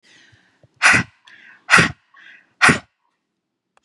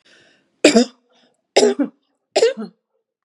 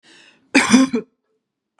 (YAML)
exhalation_length: 3.8 s
exhalation_amplitude: 32768
exhalation_signal_mean_std_ratio: 0.31
three_cough_length: 3.2 s
three_cough_amplitude: 32768
three_cough_signal_mean_std_ratio: 0.35
cough_length: 1.8 s
cough_amplitude: 32721
cough_signal_mean_std_ratio: 0.38
survey_phase: beta (2021-08-13 to 2022-03-07)
age: 45-64
gender: Female
wearing_mask: 'No'
symptom_none: true
smoker_status: Never smoked
respiratory_condition_asthma: false
respiratory_condition_other: false
recruitment_source: REACT
submission_delay: 2 days
covid_test_result: Negative
covid_test_method: RT-qPCR